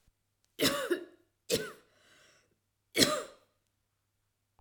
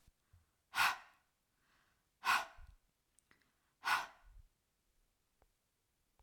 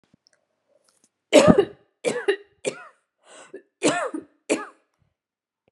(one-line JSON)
{"three_cough_length": "4.6 s", "three_cough_amplitude": 15369, "three_cough_signal_mean_std_ratio": 0.32, "exhalation_length": "6.2 s", "exhalation_amplitude": 3304, "exhalation_signal_mean_std_ratio": 0.26, "cough_length": "5.7 s", "cough_amplitude": 32767, "cough_signal_mean_std_ratio": 0.29, "survey_phase": "alpha (2021-03-01 to 2021-08-12)", "age": "45-64", "gender": "Female", "wearing_mask": "No", "symptom_none": true, "smoker_status": "Ex-smoker", "respiratory_condition_asthma": false, "respiratory_condition_other": false, "recruitment_source": "REACT", "submission_delay": "1 day", "covid_test_result": "Negative", "covid_test_method": "RT-qPCR"}